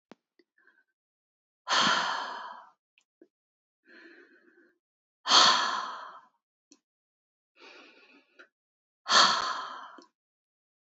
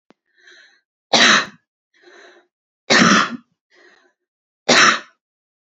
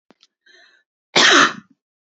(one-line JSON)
{"exhalation_length": "10.8 s", "exhalation_amplitude": 17057, "exhalation_signal_mean_std_ratio": 0.31, "three_cough_length": "5.6 s", "three_cough_amplitude": 31277, "three_cough_signal_mean_std_ratio": 0.35, "cough_length": "2.0 s", "cough_amplitude": 30691, "cough_signal_mean_std_ratio": 0.35, "survey_phase": "beta (2021-08-13 to 2022-03-07)", "age": "18-44", "gender": "Female", "wearing_mask": "No", "symptom_runny_or_blocked_nose": true, "symptom_sore_throat": true, "smoker_status": "Never smoked", "respiratory_condition_asthma": false, "respiratory_condition_other": false, "recruitment_source": "Test and Trace", "submission_delay": "0 days", "covid_test_result": "Positive", "covid_test_method": "LFT"}